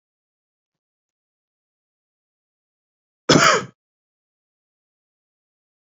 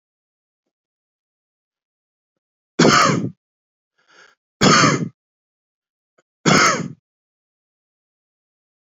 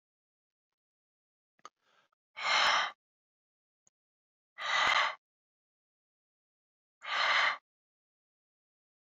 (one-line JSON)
{"cough_length": "5.8 s", "cough_amplitude": 29568, "cough_signal_mean_std_ratio": 0.18, "three_cough_length": "9.0 s", "three_cough_amplitude": 29651, "three_cough_signal_mean_std_ratio": 0.3, "exhalation_length": "9.1 s", "exhalation_amplitude": 5762, "exhalation_signal_mean_std_ratio": 0.32, "survey_phase": "beta (2021-08-13 to 2022-03-07)", "age": "18-44", "gender": "Male", "wearing_mask": "No", "symptom_cough_any": true, "symptom_new_continuous_cough": true, "symptom_runny_or_blocked_nose": true, "symptom_shortness_of_breath": true, "symptom_sore_throat": true, "symptom_fatigue": true, "symptom_fever_high_temperature": true, "symptom_headache": true, "smoker_status": "Never smoked", "respiratory_condition_asthma": false, "respiratory_condition_other": false, "recruitment_source": "Test and Trace", "submission_delay": "2 days", "covid_test_result": "Positive", "covid_test_method": "RT-qPCR"}